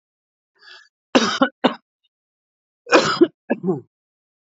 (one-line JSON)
{"cough_length": "4.5 s", "cough_amplitude": 28337, "cough_signal_mean_std_ratio": 0.32, "survey_phase": "beta (2021-08-13 to 2022-03-07)", "age": "45-64", "gender": "Male", "wearing_mask": "No", "symptom_cough_any": true, "symptom_runny_or_blocked_nose": true, "symptom_fatigue": true, "symptom_headache": true, "smoker_status": "Ex-smoker", "respiratory_condition_asthma": false, "respiratory_condition_other": false, "recruitment_source": "Test and Trace", "submission_delay": "2 days", "covid_test_result": "Positive", "covid_test_method": "ePCR"}